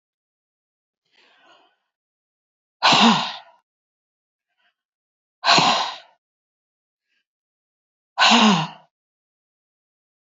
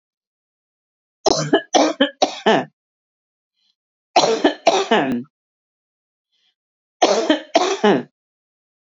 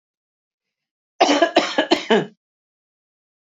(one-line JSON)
{"exhalation_length": "10.2 s", "exhalation_amplitude": 27155, "exhalation_signal_mean_std_ratio": 0.29, "three_cough_length": "9.0 s", "three_cough_amplitude": 31922, "three_cough_signal_mean_std_ratio": 0.4, "cough_length": "3.6 s", "cough_amplitude": 26770, "cough_signal_mean_std_ratio": 0.35, "survey_phase": "beta (2021-08-13 to 2022-03-07)", "age": "45-64", "gender": "Female", "wearing_mask": "No", "symptom_none": true, "smoker_status": "Never smoked", "respiratory_condition_asthma": false, "respiratory_condition_other": false, "recruitment_source": "REACT", "submission_delay": "3 days", "covid_test_result": "Negative", "covid_test_method": "RT-qPCR", "influenza_a_test_result": "Negative", "influenza_b_test_result": "Negative"}